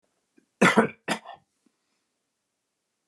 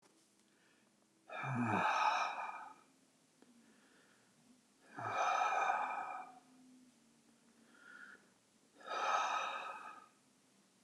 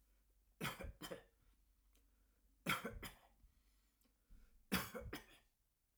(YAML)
cough_length: 3.1 s
cough_amplitude: 23133
cough_signal_mean_std_ratio: 0.24
exhalation_length: 10.8 s
exhalation_amplitude: 2555
exhalation_signal_mean_std_ratio: 0.5
three_cough_length: 6.0 s
three_cough_amplitude: 2188
three_cough_signal_mean_std_ratio: 0.37
survey_phase: alpha (2021-03-01 to 2021-08-12)
age: 65+
gender: Male
wearing_mask: 'No'
symptom_none: true
smoker_status: Never smoked
respiratory_condition_asthma: false
respiratory_condition_other: false
recruitment_source: REACT
submission_delay: 1 day
covid_test_result: Negative
covid_test_method: RT-qPCR